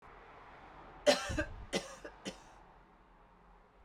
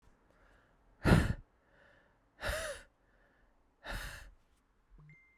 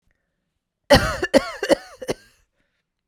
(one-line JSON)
{"three_cough_length": "3.8 s", "three_cough_amplitude": 7181, "three_cough_signal_mean_std_ratio": 0.36, "exhalation_length": "5.4 s", "exhalation_amplitude": 9229, "exhalation_signal_mean_std_ratio": 0.28, "cough_length": "3.1 s", "cough_amplitude": 32767, "cough_signal_mean_std_ratio": 0.3, "survey_phase": "beta (2021-08-13 to 2022-03-07)", "age": "18-44", "gender": "Female", "wearing_mask": "Yes", "symptom_new_continuous_cough": true, "symptom_abdominal_pain": true, "symptom_headache": true, "symptom_onset": "4 days", "smoker_status": "Never smoked", "respiratory_condition_asthma": false, "respiratory_condition_other": false, "recruitment_source": "Test and Trace", "submission_delay": "1 day", "covid_test_result": "Positive", "covid_test_method": "RT-qPCR"}